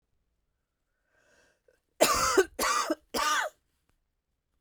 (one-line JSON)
{"cough_length": "4.6 s", "cough_amplitude": 12371, "cough_signal_mean_std_ratio": 0.39, "survey_phase": "beta (2021-08-13 to 2022-03-07)", "age": "45-64", "gender": "Female", "wearing_mask": "No", "symptom_cough_any": true, "symptom_runny_or_blocked_nose": true, "symptom_fatigue": true, "symptom_fever_high_temperature": true, "symptom_headache": true, "symptom_change_to_sense_of_smell_or_taste": true, "symptom_onset": "3 days", "smoker_status": "Never smoked", "respiratory_condition_asthma": false, "respiratory_condition_other": false, "recruitment_source": "Test and Trace", "submission_delay": "2 days", "covid_test_result": "Positive", "covid_test_method": "RT-qPCR"}